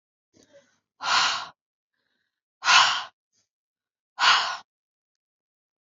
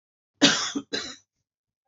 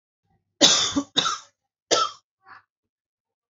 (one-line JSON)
{"exhalation_length": "5.8 s", "exhalation_amplitude": 24824, "exhalation_signal_mean_std_ratio": 0.33, "cough_length": "1.9 s", "cough_amplitude": 27225, "cough_signal_mean_std_ratio": 0.34, "three_cough_length": "3.5 s", "three_cough_amplitude": 32767, "three_cough_signal_mean_std_ratio": 0.35, "survey_phase": "beta (2021-08-13 to 2022-03-07)", "age": "18-44", "gender": "Female", "wearing_mask": "No", "symptom_cough_any": true, "symptom_shortness_of_breath": true, "symptom_sore_throat": true, "symptom_fatigue": true, "symptom_onset": "13 days", "smoker_status": "Current smoker (11 or more cigarettes per day)", "respiratory_condition_asthma": false, "respiratory_condition_other": false, "recruitment_source": "REACT", "submission_delay": "2 days", "covid_test_result": "Negative", "covid_test_method": "RT-qPCR", "influenza_a_test_result": "Negative", "influenza_b_test_result": "Negative"}